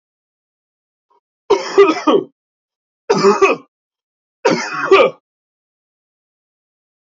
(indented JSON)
{
  "three_cough_length": "7.1 s",
  "three_cough_amplitude": 28909,
  "three_cough_signal_mean_std_ratio": 0.36,
  "survey_phase": "beta (2021-08-13 to 2022-03-07)",
  "age": "18-44",
  "gender": "Male",
  "wearing_mask": "Yes",
  "symptom_cough_any": true,
  "symptom_runny_or_blocked_nose": true,
  "smoker_status": "Never smoked",
  "respiratory_condition_asthma": false,
  "respiratory_condition_other": false,
  "recruitment_source": "Test and Trace",
  "submission_delay": "2 days",
  "covid_test_result": "Positive",
  "covid_test_method": "RT-qPCR",
  "covid_ct_value": 18.9,
  "covid_ct_gene": "ORF1ab gene",
  "covid_ct_mean": 19.4,
  "covid_viral_load": "420000 copies/ml",
  "covid_viral_load_category": "Low viral load (10K-1M copies/ml)"
}